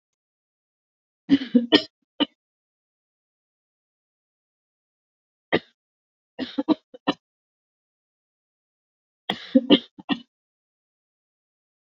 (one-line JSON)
{"three_cough_length": "11.9 s", "three_cough_amplitude": 26567, "three_cough_signal_mean_std_ratio": 0.2, "survey_phase": "beta (2021-08-13 to 2022-03-07)", "age": "65+", "gender": "Female", "wearing_mask": "No", "symptom_none": true, "smoker_status": "Never smoked", "respiratory_condition_asthma": false, "respiratory_condition_other": false, "recruitment_source": "REACT", "submission_delay": "1 day", "covid_test_result": "Negative", "covid_test_method": "RT-qPCR"}